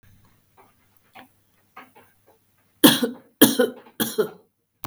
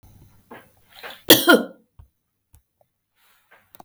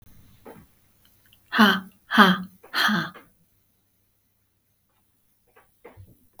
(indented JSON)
{
  "three_cough_length": "4.9 s",
  "three_cough_amplitude": 32768,
  "three_cough_signal_mean_std_ratio": 0.27,
  "cough_length": "3.8 s",
  "cough_amplitude": 32768,
  "cough_signal_mean_std_ratio": 0.22,
  "exhalation_length": "6.4 s",
  "exhalation_amplitude": 31521,
  "exhalation_signal_mean_std_ratio": 0.29,
  "survey_phase": "beta (2021-08-13 to 2022-03-07)",
  "age": "45-64",
  "gender": "Female",
  "wearing_mask": "No",
  "symptom_none": true,
  "smoker_status": "Never smoked",
  "respiratory_condition_asthma": false,
  "respiratory_condition_other": false,
  "recruitment_source": "REACT",
  "submission_delay": "1 day",
  "covid_test_result": "Negative",
  "covid_test_method": "RT-qPCR",
  "influenza_a_test_result": "Negative",
  "influenza_b_test_result": "Negative"
}